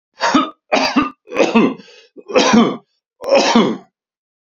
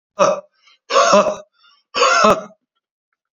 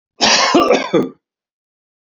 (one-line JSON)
{"three_cough_length": "4.4 s", "three_cough_amplitude": 32767, "three_cough_signal_mean_std_ratio": 0.56, "exhalation_length": "3.3 s", "exhalation_amplitude": 32768, "exhalation_signal_mean_std_ratio": 0.47, "cough_length": "2.0 s", "cough_amplitude": 32768, "cough_signal_mean_std_ratio": 0.53, "survey_phase": "beta (2021-08-13 to 2022-03-07)", "age": "45-64", "gender": "Male", "wearing_mask": "No", "symptom_none": true, "smoker_status": "Never smoked", "respiratory_condition_asthma": false, "respiratory_condition_other": false, "recruitment_source": "REACT", "submission_delay": "4 days", "covid_test_result": "Negative", "covid_test_method": "RT-qPCR", "influenza_a_test_result": "Unknown/Void", "influenza_b_test_result": "Unknown/Void"}